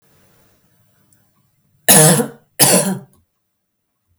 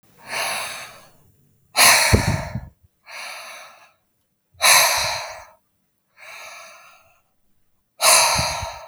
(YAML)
cough_length: 4.2 s
cough_amplitude: 32768
cough_signal_mean_std_ratio: 0.34
exhalation_length: 8.9 s
exhalation_amplitude: 32768
exhalation_signal_mean_std_ratio: 0.42
survey_phase: beta (2021-08-13 to 2022-03-07)
age: 18-44
gender: Female
wearing_mask: 'No'
symptom_none: true
smoker_status: Ex-smoker
respiratory_condition_asthma: false
respiratory_condition_other: false
recruitment_source: REACT
submission_delay: 1 day
covid_test_result: Negative
covid_test_method: RT-qPCR